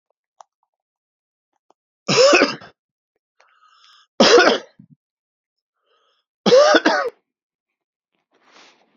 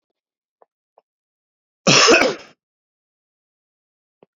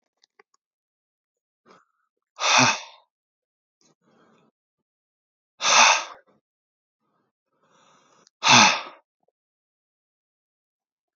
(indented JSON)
{
  "three_cough_length": "9.0 s",
  "three_cough_amplitude": 32767,
  "three_cough_signal_mean_std_ratio": 0.32,
  "cough_length": "4.4 s",
  "cough_amplitude": 32767,
  "cough_signal_mean_std_ratio": 0.26,
  "exhalation_length": "11.2 s",
  "exhalation_amplitude": 28744,
  "exhalation_signal_mean_std_ratio": 0.24,
  "survey_phase": "beta (2021-08-13 to 2022-03-07)",
  "age": "45-64",
  "gender": "Male",
  "wearing_mask": "No",
  "symptom_new_continuous_cough": true,
  "symptom_onset": "4 days",
  "smoker_status": "Never smoked",
  "respiratory_condition_asthma": false,
  "respiratory_condition_other": false,
  "recruitment_source": "Test and Trace",
  "submission_delay": "3 days",
  "covid_test_result": "Positive",
  "covid_test_method": "RT-qPCR",
  "covid_ct_value": 18.2,
  "covid_ct_gene": "ORF1ab gene",
  "covid_ct_mean": 19.0,
  "covid_viral_load": "570000 copies/ml",
  "covid_viral_load_category": "Low viral load (10K-1M copies/ml)"
}